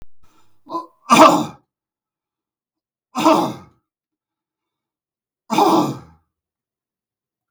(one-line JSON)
{"three_cough_length": "7.5 s", "three_cough_amplitude": 32768, "three_cough_signal_mean_std_ratio": 0.31, "survey_phase": "beta (2021-08-13 to 2022-03-07)", "age": "65+", "gender": "Male", "wearing_mask": "No", "symptom_none": true, "smoker_status": "Ex-smoker", "respiratory_condition_asthma": false, "respiratory_condition_other": false, "recruitment_source": "REACT", "submission_delay": "2 days", "covid_test_result": "Negative", "covid_test_method": "RT-qPCR", "influenza_a_test_result": "Negative", "influenza_b_test_result": "Negative"}